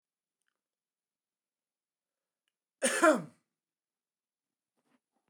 {"cough_length": "5.3 s", "cough_amplitude": 8422, "cough_signal_mean_std_ratio": 0.19, "survey_phase": "beta (2021-08-13 to 2022-03-07)", "age": "45-64", "gender": "Male", "wearing_mask": "No", "symptom_cough_any": true, "symptom_runny_or_blocked_nose": true, "symptom_change_to_sense_of_smell_or_taste": true, "symptom_loss_of_taste": true, "smoker_status": "Never smoked", "respiratory_condition_asthma": false, "respiratory_condition_other": false, "recruitment_source": "Test and Trace", "submission_delay": "2 days", "covid_test_result": "Positive", "covid_test_method": "RT-qPCR", "covid_ct_value": 15.5, "covid_ct_gene": "ORF1ab gene", "covid_ct_mean": 17.1, "covid_viral_load": "2500000 copies/ml", "covid_viral_load_category": "High viral load (>1M copies/ml)"}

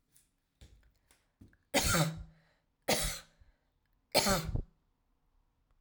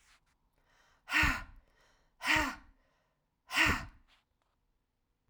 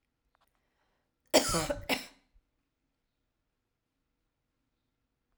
{"three_cough_length": "5.8 s", "three_cough_amplitude": 8527, "three_cough_signal_mean_std_ratio": 0.36, "exhalation_length": "5.3 s", "exhalation_amplitude": 5841, "exhalation_signal_mean_std_ratio": 0.34, "cough_length": "5.4 s", "cough_amplitude": 11845, "cough_signal_mean_std_ratio": 0.22, "survey_phase": "alpha (2021-03-01 to 2021-08-12)", "age": "45-64", "gender": "Female", "wearing_mask": "No", "symptom_none": true, "smoker_status": "Never smoked", "respiratory_condition_asthma": false, "respiratory_condition_other": false, "recruitment_source": "REACT", "submission_delay": "18 days", "covid_test_result": "Negative", "covid_test_method": "RT-qPCR"}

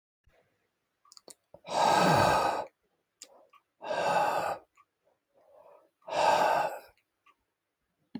{"exhalation_length": "8.2 s", "exhalation_amplitude": 8524, "exhalation_signal_mean_std_ratio": 0.45, "survey_phase": "alpha (2021-03-01 to 2021-08-12)", "age": "65+", "gender": "Male", "wearing_mask": "No", "symptom_none": true, "smoker_status": "Never smoked", "respiratory_condition_asthma": false, "respiratory_condition_other": false, "recruitment_source": "REACT", "submission_delay": "2 days", "covid_test_result": "Negative", "covid_test_method": "RT-qPCR"}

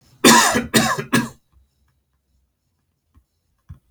{"three_cough_length": "3.9 s", "three_cough_amplitude": 32708, "three_cough_signal_mean_std_ratio": 0.34, "survey_phase": "beta (2021-08-13 to 2022-03-07)", "age": "45-64", "gender": "Male", "wearing_mask": "No", "symptom_runny_or_blocked_nose": true, "smoker_status": "Never smoked", "respiratory_condition_asthma": false, "respiratory_condition_other": false, "recruitment_source": "REACT", "submission_delay": "6 days", "covid_test_result": "Negative", "covid_test_method": "RT-qPCR"}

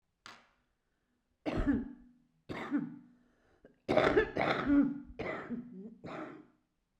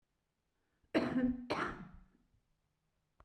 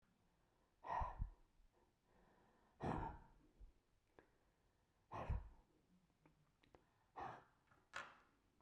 {"three_cough_length": "7.0 s", "three_cough_amplitude": 7387, "three_cough_signal_mean_std_ratio": 0.46, "cough_length": "3.2 s", "cough_amplitude": 3696, "cough_signal_mean_std_ratio": 0.4, "exhalation_length": "8.6 s", "exhalation_amplitude": 767, "exhalation_signal_mean_std_ratio": 0.36, "survey_phase": "beta (2021-08-13 to 2022-03-07)", "age": "65+", "gender": "Female", "wearing_mask": "No", "symptom_cough_any": true, "symptom_new_continuous_cough": true, "symptom_runny_or_blocked_nose": true, "symptom_sore_throat": true, "smoker_status": "Ex-smoker", "respiratory_condition_asthma": false, "respiratory_condition_other": false, "recruitment_source": "Test and Trace", "submission_delay": "1 day", "covid_test_result": "Positive", "covid_test_method": "RT-qPCR"}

